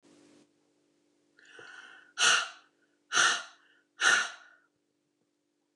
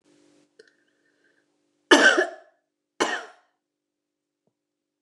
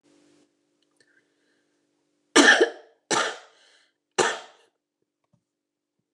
{
  "exhalation_length": "5.8 s",
  "exhalation_amplitude": 9384,
  "exhalation_signal_mean_std_ratio": 0.32,
  "cough_length": "5.0 s",
  "cough_amplitude": 28631,
  "cough_signal_mean_std_ratio": 0.24,
  "three_cough_length": "6.1 s",
  "three_cough_amplitude": 24072,
  "three_cough_signal_mean_std_ratio": 0.25,
  "survey_phase": "alpha (2021-03-01 to 2021-08-12)",
  "age": "65+",
  "gender": "Female",
  "wearing_mask": "No",
  "symptom_none": true,
  "smoker_status": "Ex-smoker",
  "respiratory_condition_asthma": true,
  "respiratory_condition_other": false,
  "recruitment_source": "REACT",
  "submission_delay": "2 days",
  "covid_test_result": "Negative",
  "covid_test_method": "RT-qPCR"
}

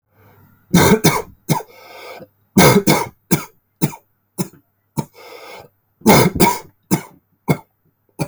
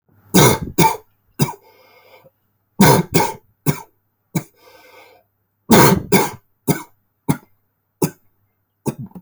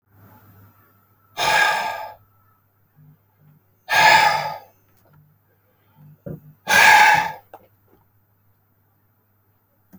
{
  "cough_length": "8.3 s",
  "cough_amplitude": 32768,
  "cough_signal_mean_std_ratio": 0.39,
  "three_cough_length": "9.2 s",
  "three_cough_amplitude": 32768,
  "three_cough_signal_mean_std_ratio": 0.35,
  "exhalation_length": "10.0 s",
  "exhalation_amplitude": 29080,
  "exhalation_signal_mean_std_ratio": 0.34,
  "survey_phase": "alpha (2021-03-01 to 2021-08-12)",
  "age": "18-44",
  "gender": "Male",
  "wearing_mask": "No",
  "symptom_cough_any": true,
  "symptom_new_continuous_cough": true,
  "symptom_fatigue": true,
  "symptom_onset": "2 days",
  "smoker_status": "Never smoked",
  "respiratory_condition_asthma": false,
  "respiratory_condition_other": false,
  "recruitment_source": "Test and Trace",
  "submission_delay": "2 days",
  "covid_test_result": "Positive",
  "covid_test_method": "RT-qPCR",
  "covid_ct_value": 18.8,
  "covid_ct_gene": "ORF1ab gene"
}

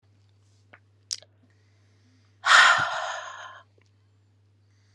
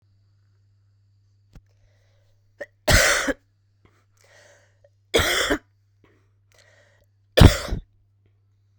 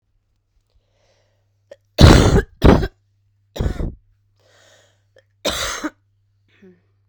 {
  "exhalation_length": "4.9 s",
  "exhalation_amplitude": 23930,
  "exhalation_signal_mean_std_ratio": 0.28,
  "three_cough_length": "8.8 s",
  "three_cough_amplitude": 32768,
  "three_cough_signal_mean_std_ratio": 0.25,
  "cough_length": "7.1 s",
  "cough_amplitude": 32768,
  "cough_signal_mean_std_ratio": 0.29,
  "survey_phase": "beta (2021-08-13 to 2022-03-07)",
  "age": "18-44",
  "gender": "Female",
  "wearing_mask": "No",
  "symptom_cough_any": true,
  "symptom_sore_throat": true,
  "symptom_headache": true,
  "symptom_change_to_sense_of_smell_or_taste": true,
  "symptom_loss_of_taste": true,
  "smoker_status": "Current smoker (1 to 10 cigarettes per day)",
  "respiratory_condition_asthma": false,
  "respiratory_condition_other": false,
  "recruitment_source": "Test and Trace",
  "submission_delay": "2 days",
  "covid_test_result": "Positive",
  "covid_test_method": "LFT"
}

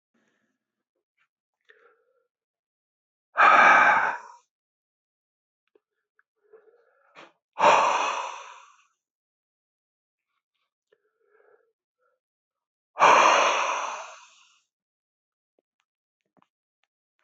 {
  "exhalation_length": "17.2 s",
  "exhalation_amplitude": 19114,
  "exhalation_signal_mean_std_ratio": 0.28,
  "survey_phase": "beta (2021-08-13 to 2022-03-07)",
  "age": "45-64",
  "gender": "Male",
  "wearing_mask": "No",
  "symptom_cough_any": true,
  "symptom_runny_or_blocked_nose": true,
  "symptom_other": true,
  "symptom_onset": "6 days",
  "smoker_status": "Never smoked",
  "respiratory_condition_asthma": false,
  "respiratory_condition_other": false,
  "recruitment_source": "Test and Trace",
  "submission_delay": "2 days",
  "covid_test_result": "Positive",
  "covid_test_method": "RT-qPCR",
  "covid_ct_value": 20.5,
  "covid_ct_gene": "ORF1ab gene"
}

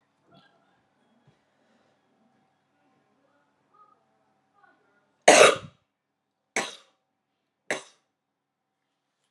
{
  "three_cough_length": "9.3 s",
  "three_cough_amplitude": 31805,
  "three_cough_signal_mean_std_ratio": 0.16,
  "survey_phase": "beta (2021-08-13 to 2022-03-07)",
  "age": "18-44",
  "gender": "Female",
  "wearing_mask": "No",
  "symptom_cough_any": true,
  "symptom_shortness_of_breath": true,
  "symptom_sore_throat": true,
  "symptom_change_to_sense_of_smell_or_taste": true,
  "symptom_loss_of_taste": true,
  "symptom_other": true,
  "symptom_onset": "3 days",
  "smoker_status": "Never smoked",
  "respiratory_condition_asthma": false,
  "respiratory_condition_other": false,
  "recruitment_source": "Test and Trace",
  "submission_delay": "1 day",
  "covid_test_result": "Positive",
  "covid_test_method": "RT-qPCR",
  "covid_ct_value": 21.8,
  "covid_ct_gene": "N gene"
}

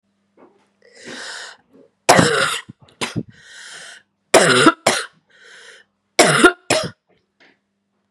{
  "three_cough_length": "8.1 s",
  "three_cough_amplitude": 32768,
  "three_cough_signal_mean_std_ratio": 0.36,
  "survey_phase": "beta (2021-08-13 to 2022-03-07)",
  "age": "18-44",
  "gender": "Female",
  "wearing_mask": "No",
  "symptom_cough_any": true,
  "symptom_runny_or_blocked_nose": true,
  "symptom_headache": true,
  "symptom_onset": "5 days",
  "smoker_status": "Never smoked",
  "respiratory_condition_asthma": false,
  "respiratory_condition_other": false,
  "recruitment_source": "Test and Trace",
  "submission_delay": "2 days",
  "covid_test_result": "Positive",
  "covid_test_method": "RT-qPCR",
  "covid_ct_value": 25.2,
  "covid_ct_gene": "N gene"
}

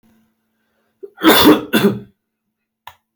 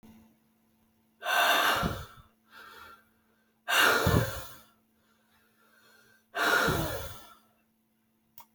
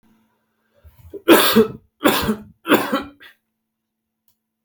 {
  "cough_length": "3.2 s",
  "cough_amplitude": 32768,
  "cough_signal_mean_std_ratio": 0.36,
  "exhalation_length": "8.5 s",
  "exhalation_amplitude": 10411,
  "exhalation_signal_mean_std_ratio": 0.43,
  "three_cough_length": "4.6 s",
  "three_cough_amplitude": 30806,
  "three_cough_signal_mean_std_ratio": 0.36,
  "survey_phase": "alpha (2021-03-01 to 2021-08-12)",
  "age": "18-44",
  "gender": "Male",
  "wearing_mask": "No",
  "symptom_none": true,
  "smoker_status": "Never smoked",
  "respiratory_condition_asthma": true,
  "respiratory_condition_other": false,
  "recruitment_source": "REACT",
  "submission_delay": "2 days",
  "covid_test_result": "Negative",
  "covid_test_method": "RT-qPCR"
}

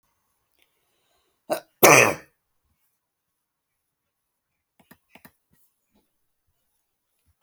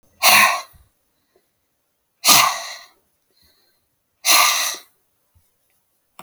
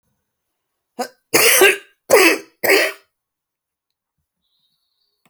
{
  "cough_length": "7.4 s",
  "cough_amplitude": 32768,
  "cough_signal_mean_std_ratio": 0.16,
  "exhalation_length": "6.2 s",
  "exhalation_amplitude": 32768,
  "exhalation_signal_mean_std_ratio": 0.34,
  "three_cough_length": "5.3 s",
  "three_cough_amplitude": 32768,
  "three_cough_signal_mean_std_ratio": 0.35,
  "survey_phase": "beta (2021-08-13 to 2022-03-07)",
  "age": "45-64",
  "gender": "Female",
  "wearing_mask": "No",
  "symptom_fatigue": true,
  "smoker_status": "Never smoked",
  "respiratory_condition_asthma": true,
  "respiratory_condition_other": true,
  "recruitment_source": "REACT",
  "submission_delay": "2 days",
  "covid_test_result": "Negative",
  "covid_test_method": "RT-qPCR"
}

